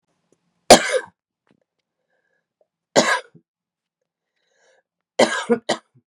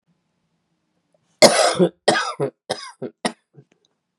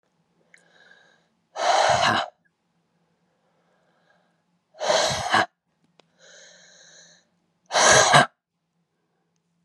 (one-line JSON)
{"three_cough_length": "6.1 s", "three_cough_amplitude": 32768, "three_cough_signal_mean_std_ratio": 0.24, "cough_length": "4.2 s", "cough_amplitude": 32768, "cough_signal_mean_std_ratio": 0.33, "exhalation_length": "9.6 s", "exhalation_amplitude": 27799, "exhalation_signal_mean_std_ratio": 0.34, "survey_phase": "beta (2021-08-13 to 2022-03-07)", "age": "45-64", "gender": "Female", "wearing_mask": "No", "symptom_cough_any": true, "symptom_runny_or_blocked_nose": true, "symptom_shortness_of_breath": true, "symptom_sore_throat": true, "symptom_fatigue": true, "symptom_onset": "3 days", "smoker_status": "Ex-smoker", "respiratory_condition_asthma": false, "respiratory_condition_other": false, "recruitment_source": "Test and Trace", "submission_delay": "2 days", "covid_test_result": "Positive", "covid_test_method": "RT-qPCR", "covid_ct_value": 20.9, "covid_ct_gene": "N gene"}